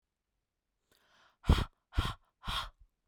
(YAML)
exhalation_length: 3.1 s
exhalation_amplitude: 7444
exhalation_signal_mean_std_ratio: 0.27
survey_phase: beta (2021-08-13 to 2022-03-07)
age: 18-44
gender: Female
wearing_mask: 'No'
symptom_none: true
smoker_status: Never smoked
respiratory_condition_asthma: false
respiratory_condition_other: false
recruitment_source: REACT
submission_delay: 6 days
covid_test_result: Negative
covid_test_method: RT-qPCR
influenza_a_test_result: Negative
influenza_b_test_result: Negative